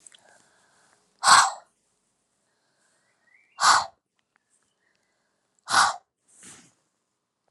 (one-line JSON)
{"exhalation_length": "7.5 s", "exhalation_amplitude": 27610, "exhalation_signal_mean_std_ratio": 0.24, "survey_phase": "alpha (2021-03-01 to 2021-08-12)", "age": "45-64", "gender": "Female", "wearing_mask": "No", "symptom_abdominal_pain": true, "symptom_fatigue": true, "symptom_headache": true, "symptom_change_to_sense_of_smell_or_taste": true, "symptom_onset": "8 days", "smoker_status": "Never smoked", "respiratory_condition_asthma": false, "respiratory_condition_other": false, "recruitment_source": "Test and Trace", "submission_delay": "2 days", "covid_test_result": "Positive", "covid_test_method": "RT-qPCR", "covid_ct_value": 25.3, "covid_ct_gene": "ORF1ab gene"}